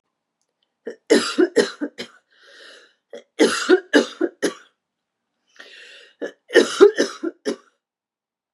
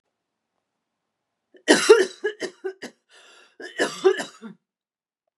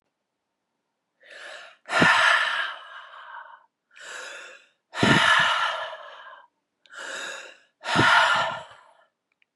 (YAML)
three_cough_length: 8.5 s
three_cough_amplitude: 32380
three_cough_signal_mean_std_ratio: 0.33
cough_length: 5.4 s
cough_amplitude: 30885
cough_signal_mean_std_ratio: 0.28
exhalation_length: 9.6 s
exhalation_amplitude: 19670
exhalation_signal_mean_std_ratio: 0.46
survey_phase: beta (2021-08-13 to 2022-03-07)
age: 45-64
gender: Female
wearing_mask: 'No'
symptom_shortness_of_breath: true
symptom_fatigue: true
smoker_status: Never smoked
respiratory_condition_asthma: false
respiratory_condition_other: false
recruitment_source: Test and Trace
submission_delay: 2 days
covid_test_result: Positive
covid_test_method: RT-qPCR
covid_ct_value: 20.0
covid_ct_gene: ORF1ab gene